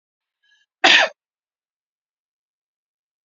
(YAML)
cough_length: 3.2 s
cough_amplitude: 30556
cough_signal_mean_std_ratio: 0.21
survey_phase: beta (2021-08-13 to 2022-03-07)
age: 45-64
gender: Female
wearing_mask: 'No'
symptom_cough_any: true
symptom_runny_or_blocked_nose: true
smoker_status: Never smoked
respiratory_condition_asthma: false
respiratory_condition_other: false
recruitment_source: Test and Trace
submission_delay: 1 day
covid_test_result: Negative
covid_test_method: LFT